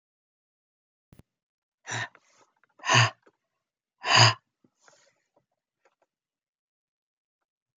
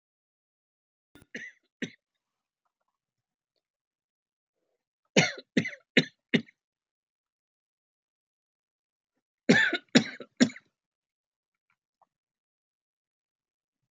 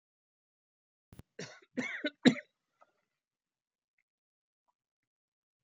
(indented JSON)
{
  "exhalation_length": "7.8 s",
  "exhalation_amplitude": 20209,
  "exhalation_signal_mean_std_ratio": 0.21,
  "three_cough_length": "13.9 s",
  "three_cough_amplitude": 23285,
  "three_cough_signal_mean_std_ratio": 0.18,
  "cough_length": "5.6 s",
  "cough_amplitude": 10573,
  "cough_signal_mean_std_ratio": 0.16,
  "survey_phase": "alpha (2021-03-01 to 2021-08-12)",
  "age": "45-64",
  "gender": "Male",
  "wearing_mask": "No",
  "symptom_none": true,
  "smoker_status": "Ex-smoker",
  "respiratory_condition_asthma": false,
  "respiratory_condition_other": false,
  "recruitment_source": "REACT",
  "submission_delay": "1 day",
  "covid_test_result": "Negative",
  "covid_test_method": "RT-qPCR"
}